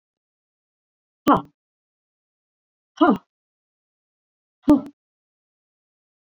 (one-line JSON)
{"exhalation_length": "6.4 s", "exhalation_amplitude": 22334, "exhalation_signal_mean_std_ratio": 0.2, "survey_phase": "beta (2021-08-13 to 2022-03-07)", "age": "45-64", "gender": "Female", "wearing_mask": "No", "symptom_none": true, "smoker_status": "Never smoked", "respiratory_condition_asthma": false, "respiratory_condition_other": false, "recruitment_source": "REACT", "submission_delay": "3 days", "covid_test_result": "Negative", "covid_test_method": "RT-qPCR", "influenza_a_test_result": "Negative", "influenza_b_test_result": "Negative"}